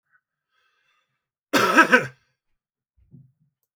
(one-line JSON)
{"cough_length": "3.8 s", "cough_amplitude": 27358, "cough_signal_mean_std_ratio": 0.26, "survey_phase": "beta (2021-08-13 to 2022-03-07)", "age": "65+", "gender": "Male", "wearing_mask": "No", "symptom_none": true, "smoker_status": "Ex-smoker", "respiratory_condition_asthma": false, "respiratory_condition_other": false, "recruitment_source": "REACT", "submission_delay": "2 days", "covid_test_result": "Negative", "covid_test_method": "RT-qPCR"}